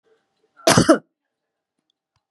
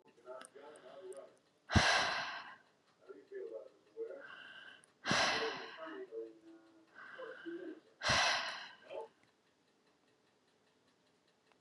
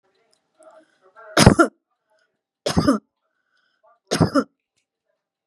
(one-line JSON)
{"cough_length": "2.3 s", "cough_amplitude": 32035, "cough_signal_mean_std_ratio": 0.26, "exhalation_length": "11.6 s", "exhalation_amplitude": 6426, "exhalation_signal_mean_std_ratio": 0.42, "three_cough_length": "5.5 s", "three_cough_amplitude": 32768, "three_cough_signal_mean_std_ratio": 0.27, "survey_phase": "beta (2021-08-13 to 2022-03-07)", "age": "65+", "gender": "Female", "wearing_mask": "No", "symptom_none": true, "smoker_status": "Ex-smoker", "respiratory_condition_asthma": false, "respiratory_condition_other": false, "recruitment_source": "REACT", "submission_delay": "1 day", "covid_test_result": "Negative", "covid_test_method": "RT-qPCR", "influenza_a_test_result": "Negative", "influenza_b_test_result": "Negative"}